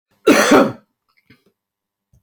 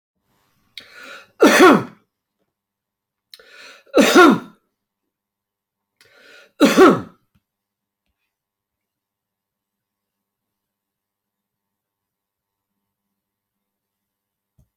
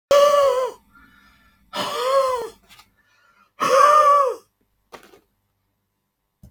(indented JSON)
{
  "cough_length": "2.2 s",
  "cough_amplitude": 31232,
  "cough_signal_mean_std_ratio": 0.36,
  "three_cough_length": "14.8 s",
  "three_cough_amplitude": 29141,
  "three_cough_signal_mean_std_ratio": 0.23,
  "exhalation_length": "6.5 s",
  "exhalation_amplitude": 23997,
  "exhalation_signal_mean_std_ratio": 0.47,
  "survey_phase": "beta (2021-08-13 to 2022-03-07)",
  "age": "45-64",
  "gender": "Male",
  "wearing_mask": "No",
  "symptom_none": true,
  "smoker_status": "Ex-smoker",
  "respiratory_condition_asthma": false,
  "respiratory_condition_other": false,
  "recruitment_source": "REACT",
  "submission_delay": "1 day",
  "covid_test_result": "Negative",
  "covid_test_method": "RT-qPCR"
}